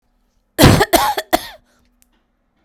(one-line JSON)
{"cough_length": "2.6 s", "cough_amplitude": 32768, "cough_signal_mean_std_ratio": 0.36, "survey_phase": "beta (2021-08-13 to 2022-03-07)", "age": "18-44", "gender": "Female", "wearing_mask": "No", "symptom_cough_any": true, "symptom_fatigue": true, "symptom_change_to_sense_of_smell_or_taste": true, "symptom_loss_of_taste": true, "symptom_onset": "4 days", "smoker_status": "Never smoked", "respiratory_condition_asthma": false, "respiratory_condition_other": false, "recruitment_source": "Test and Trace", "submission_delay": "3 days", "covid_test_result": "Positive", "covid_test_method": "RT-qPCR"}